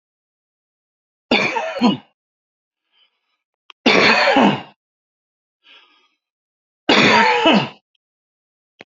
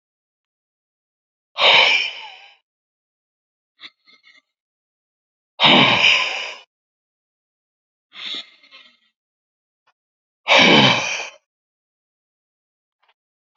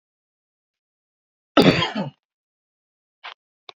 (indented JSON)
{
  "three_cough_length": "8.9 s",
  "three_cough_amplitude": 32768,
  "three_cough_signal_mean_std_ratio": 0.39,
  "exhalation_length": "13.6 s",
  "exhalation_amplitude": 32768,
  "exhalation_signal_mean_std_ratio": 0.31,
  "cough_length": "3.8 s",
  "cough_amplitude": 32767,
  "cough_signal_mean_std_ratio": 0.24,
  "survey_phase": "beta (2021-08-13 to 2022-03-07)",
  "age": "45-64",
  "gender": "Male",
  "wearing_mask": "No",
  "symptom_headache": true,
  "smoker_status": "Never smoked",
  "respiratory_condition_asthma": false,
  "respiratory_condition_other": false,
  "recruitment_source": "Test and Trace",
  "submission_delay": "1 day",
  "covid_test_result": "Positive",
  "covid_test_method": "RT-qPCR",
  "covid_ct_value": 20.7,
  "covid_ct_gene": "ORF1ab gene"
}